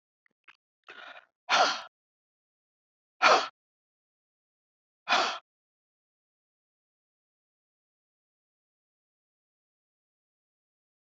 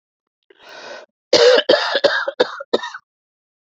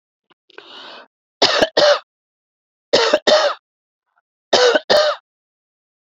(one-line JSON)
{"exhalation_length": "11.0 s", "exhalation_amplitude": 15743, "exhalation_signal_mean_std_ratio": 0.2, "cough_length": "3.8 s", "cough_amplitude": 30071, "cough_signal_mean_std_ratio": 0.41, "three_cough_length": "6.1 s", "three_cough_amplitude": 32767, "three_cough_signal_mean_std_ratio": 0.41, "survey_phase": "beta (2021-08-13 to 2022-03-07)", "age": "65+", "gender": "Female", "wearing_mask": "No", "symptom_none": true, "smoker_status": "Ex-smoker", "respiratory_condition_asthma": false, "respiratory_condition_other": false, "recruitment_source": "REACT", "submission_delay": "3 days", "covid_test_result": "Negative", "covid_test_method": "RT-qPCR", "influenza_a_test_result": "Negative", "influenza_b_test_result": "Negative"}